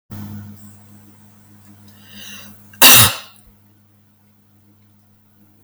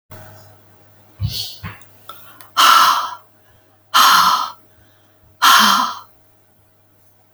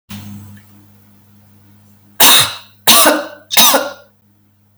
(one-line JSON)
{"cough_length": "5.6 s", "cough_amplitude": 32768, "cough_signal_mean_std_ratio": 0.25, "exhalation_length": "7.3 s", "exhalation_amplitude": 32768, "exhalation_signal_mean_std_ratio": 0.43, "three_cough_length": "4.8 s", "three_cough_amplitude": 32768, "three_cough_signal_mean_std_ratio": 0.41, "survey_phase": "beta (2021-08-13 to 2022-03-07)", "age": "65+", "gender": "Female", "wearing_mask": "No", "symptom_none": true, "smoker_status": "Ex-smoker", "respiratory_condition_asthma": false, "respiratory_condition_other": false, "recruitment_source": "REACT", "submission_delay": "1 day", "covid_test_result": "Negative", "covid_test_method": "RT-qPCR"}